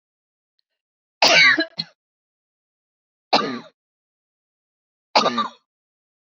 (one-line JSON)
{"three_cough_length": "6.4 s", "three_cough_amplitude": 29920, "three_cough_signal_mean_std_ratio": 0.29, "survey_phase": "beta (2021-08-13 to 2022-03-07)", "age": "65+", "gender": "Female", "wearing_mask": "No", "symptom_none": true, "smoker_status": "Ex-smoker", "respiratory_condition_asthma": false, "respiratory_condition_other": false, "recruitment_source": "REACT", "submission_delay": "1 day", "covid_test_result": "Negative", "covid_test_method": "RT-qPCR", "influenza_a_test_result": "Negative", "influenza_b_test_result": "Negative"}